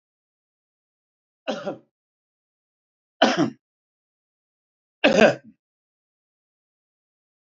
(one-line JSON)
{"three_cough_length": "7.4 s", "three_cough_amplitude": 27870, "three_cough_signal_mean_std_ratio": 0.22, "survey_phase": "beta (2021-08-13 to 2022-03-07)", "age": "65+", "gender": "Male", "wearing_mask": "No", "symptom_none": true, "smoker_status": "Current smoker (1 to 10 cigarettes per day)", "respiratory_condition_asthma": false, "respiratory_condition_other": false, "recruitment_source": "REACT", "submission_delay": "5 days", "covid_test_result": "Negative", "covid_test_method": "RT-qPCR", "influenza_a_test_result": "Negative", "influenza_b_test_result": "Negative"}